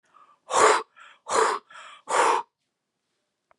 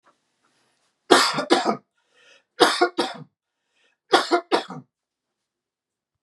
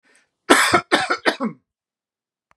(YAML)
exhalation_length: 3.6 s
exhalation_amplitude: 20123
exhalation_signal_mean_std_ratio: 0.42
three_cough_length: 6.2 s
three_cough_amplitude: 32767
three_cough_signal_mean_std_ratio: 0.33
cough_length: 2.6 s
cough_amplitude: 32768
cough_signal_mean_std_ratio: 0.39
survey_phase: beta (2021-08-13 to 2022-03-07)
age: 45-64
gender: Male
wearing_mask: 'No'
symptom_none: true
smoker_status: Never smoked
respiratory_condition_asthma: false
respiratory_condition_other: false
recruitment_source: REACT
submission_delay: 2 days
covid_test_result: Negative
covid_test_method: RT-qPCR
influenza_a_test_result: Negative
influenza_b_test_result: Negative